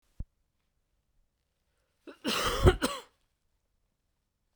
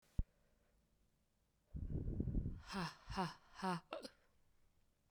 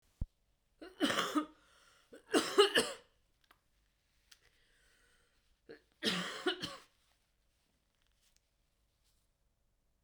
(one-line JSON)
{"cough_length": "4.6 s", "cough_amplitude": 16899, "cough_signal_mean_std_ratio": 0.26, "exhalation_length": "5.1 s", "exhalation_amplitude": 2031, "exhalation_signal_mean_std_ratio": 0.48, "three_cough_length": "10.0 s", "three_cough_amplitude": 6464, "three_cough_signal_mean_std_ratio": 0.28, "survey_phase": "beta (2021-08-13 to 2022-03-07)", "age": "18-44", "gender": "Female", "wearing_mask": "No", "symptom_cough_any": true, "symptom_runny_or_blocked_nose": true, "symptom_sore_throat": true, "symptom_fatigue": true, "symptom_other": true, "symptom_onset": "19 days", "smoker_status": "Never smoked", "respiratory_condition_asthma": true, "respiratory_condition_other": false, "recruitment_source": "Test and Trace", "submission_delay": "1 day", "covid_test_result": "Positive", "covid_test_method": "RT-qPCR", "covid_ct_value": 19.4, "covid_ct_gene": "ORF1ab gene", "covid_ct_mean": 19.6, "covid_viral_load": "360000 copies/ml", "covid_viral_load_category": "Low viral load (10K-1M copies/ml)"}